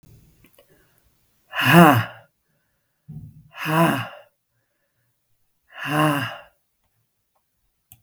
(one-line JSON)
{"exhalation_length": "8.0 s", "exhalation_amplitude": 32766, "exhalation_signal_mean_std_ratio": 0.3, "survey_phase": "beta (2021-08-13 to 2022-03-07)", "age": "45-64", "gender": "Female", "wearing_mask": "No", "symptom_cough_any": true, "symptom_runny_or_blocked_nose": true, "symptom_sore_throat": true, "symptom_abdominal_pain": true, "symptom_fatigue": true, "symptom_fever_high_temperature": true, "symptom_change_to_sense_of_smell_or_taste": true, "smoker_status": "Never smoked", "respiratory_condition_asthma": false, "respiratory_condition_other": false, "recruitment_source": "Test and Trace", "submission_delay": "1 day", "covid_test_result": "Positive", "covid_test_method": "RT-qPCR", "covid_ct_value": 24.3, "covid_ct_gene": "ORF1ab gene"}